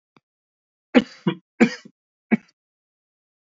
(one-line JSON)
{"cough_length": "3.5 s", "cough_amplitude": 26605, "cough_signal_mean_std_ratio": 0.21, "survey_phase": "alpha (2021-03-01 to 2021-08-12)", "age": "18-44", "gender": "Male", "wearing_mask": "No", "symptom_new_continuous_cough": true, "symptom_fatigue": true, "symptom_headache": true, "symptom_onset": "2 days", "smoker_status": "Never smoked", "respiratory_condition_asthma": false, "respiratory_condition_other": false, "recruitment_source": "Test and Trace", "submission_delay": "1 day", "covid_test_result": "Positive", "covid_test_method": "RT-qPCR", "covid_ct_value": 28.1, "covid_ct_gene": "ORF1ab gene", "covid_ct_mean": 29.4, "covid_viral_load": "220 copies/ml", "covid_viral_load_category": "Minimal viral load (< 10K copies/ml)"}